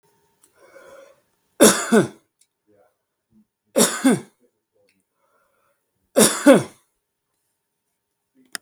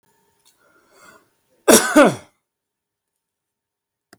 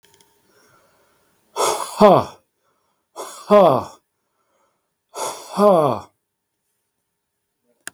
{"three_cough_length": "8.6 s", "three_cough_amplitude": 32768, "three_cough_signal_mean_std_ratio": 0.27, "cough_length": "4.2 s", "cough_amplitude": 32768, "cough_signal_mean_std_ratio": 0.24, "exhalation_length": "7.9 s", "exhalation_amplitude": 32768, "exhalation_signal_mean_std_ratio": 0.31, "survey_phase": "beta (2021-08-13 to 2022-03-07)", "age": "45-64", "gender": "Male", "wearing_mask": "No", "symptom_none": true, "smoker_status": "Never smoked", "respiratory_condition_asthma": false, "respiratory_condition_other": false, "recruitment_source": "REACT", "submission_delay": "-13 days", "covid_test_result": "Negative", "covid_test_method": "RT-qPCR", "influenza_a_test_result": "Unknown/Void", "influenza_b_test_result": "Unknown/Void"}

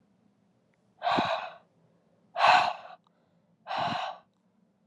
{"exhalation_length": "4.9 s", "exhalation_amplitude": 12459, "exhalation_signal_mean_std_ratio": 0.38, "survey_phase": "alpha (2021-03-01 to 2021-08-12)", "age": "18-44", "gender": "Female", "wearing_mask": "No", "symptom_cough_any": true, "symptom_shortness_of_breath": true, "symptom_fever_high_temperature": true, "symptom_headache": true, "symptom_change_to_sense_of_smell_or_taste": true, "symptom_onset": "6 days", "smoker_status": "Never smoked", "respiratory_condition_asthma": false, "respiratory_condition_other": false, "recruitment_source": "Test and Trace", "submission_delay": "2 days", "covid_test_result": "Positive", "covid_test_method": "RT-qPCR"}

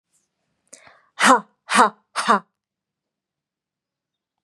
{"exhalation_length": "4.4 s", "exhalation_amplitude": 31170, "exhalation_signal_mean_std_ratio": 0.27, "survey_phase": "beta (2021-08-13 to 2022-03-07)", "age": "18-44", "gender": "Female", "wearing_mask": "No", "symptom_none": true, "smoker_status": "Never smoked", "respiratory_condition_asthma": false, "respiratory_condition_other": false, "recruitment_source": "REACT", "submission_delay": "0 days", "covid_test_result": "Negative", "covid_test_method": "RT-qPCR", "influenza_a_test_result": "Negative", "influenza_b_test_result": "Negative"}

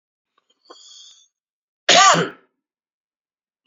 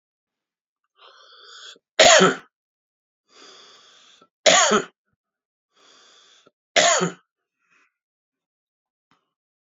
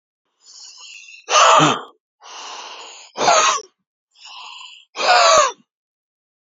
{"cough_length": "3.7 s", "cough_amplitude": 31687, "cough_signal_mean_std_ratio": 0.26, "three_cough_length": "9.7 s", "three_cough_amplitude": 30796, "three_cough_signal_mean_std_ratio": 0.26, "exhalation_length": "6.5 s", "exhalation_amplitude": 29697, "exhalation_signal_mean_std_ratio": 0.42, "survey_phase": "beta (2021-08-13 to 2022-03-07)", "age": "45-64", "gender": "Male", "wearing_mask": "No", "symptom_runny_or_blocked_nose": true, "symptom_fatigue": true, "symptom_onset": "7 days", "smoker_status": "Never smoked", "respiratory_condition_asthma": true, "respiratory_condition_other": false, "recruitment_source": "REACT", "submission_delay": "2 days", "covid_test_result": "Negative", "covid_test_method": "RT-qPCR"}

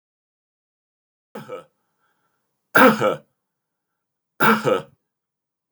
{"cough_length": "5.7 s", "cough_amplitude": 29467, "cough_signal_mean_std_ratio": 0.28, "survey_phase": "beta (2021-08-13 to 2022-03-07)", "age": "65+", "gender": "Male", "wearing_mask": "No", "symptom_none": true, "smoker_status": "Never smoked", "respiratory_condition_asthma": false, "respiratory_condition_other": false, "recruitment_source": "REACT", "submission_delay": "3 days", "covid_test_result": "Negative", "covid_test_method": "RT-qPCR", "influenza_a_test_result": "Negative", "influenza_b_test_result": "Negative"}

